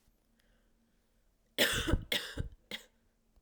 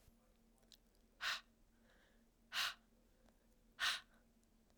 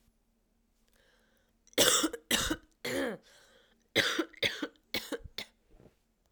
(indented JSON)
{
  "three_cough_length": "3.4 s",
  "three_cough_amplitude": 7206,
  "three_cough_signal_mean_std_ratio": 0.36,
  "exhalation_length": "4.8 s",
  "exhalation_amplitude": 1892,
  "exhalation_signal_mean_std_ratio": 0.33,
  "cough_length": "6.3 s",
  "cough_amplitude": 13591,
  "cough_signal_mean_std_ratio": 0.39,
  "survey_phase": "beta (2021-08-13 to 2022-03-07)",
  "age": "18-44",
  "gender": "Female",
  "wearing_mask": "No",
  "symptom_cough_any": true,
  "symptom_new_continuous_cough": true,
  "symptom_runny_or_blocked_nose": true,
  "symptom_sore_throat": true,
  "symptom_fever_high_temperature": true,
  "symptom_headache": true,
  "symptom_onset": "4 days",
  "smoker_status": "Never smoked",
  "respiratory_condition_asthma": false,
  "respiratory_condition_other": false,
  "recruitment_source": "Test and Trace",
  "submission_delay": "1 day",
  "covid_test_result": "Positive",
  "covid_test_method": "RT-qPCR"
}